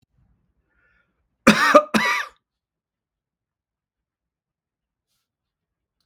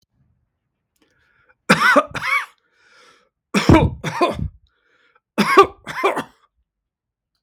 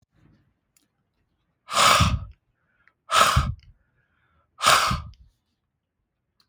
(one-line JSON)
{"cough_length": "6.1 s", "cough_amplitude": 32768, "cough_signal_mean_std_ratio": 0.22, "three_cough_length": "7.4 s", "three_cough_amplitude": 32766, "three_cough_signal_mean_std_ratio": 0.36, "exhalation_length": "6.5 s", "exhalation_amplitude": 32766, "exhalation_signal_mean_std_ratio": 0.35, "survey_phase": "beta (2021-08-13 to 2022-03-07)", "age": "65+", "gender": "Male", "wearing_mask": "No", "symptom_runny_or_blocked_nose": true, "smoker_status": "Ex-smoker", "respiratory_condition_asthma": false, "respiratory_condition_other": false, "recruitment_source": "REACT", "submission_delay": "1 day", "covid_test_result": "Negative", "covid_test_method": "RT-qPCR", "influenza_a_test_result": "Negative", "influenza_b_test_result": "Negative"}